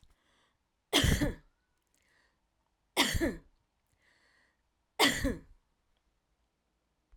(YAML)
three_cough_length: 7.2 s
three_cough_amplitude: 10268
three_cough_signal_mean_std_ratio: 0.31
survey_phase: alpha (2021-03-01 to 2021-08-12)
age: 45-64
gender: Female
wearing_mask: 'No'
symptom_none: true
symptom_onset: 12 days
smoker_status: Never smoked
respiratory_condition_asthma: false
respiratory_condition_other: false
recruitment_source: REACT
submission_delay: 2 days
covid_test_result: Negative
covid_test_method: RT-qPCR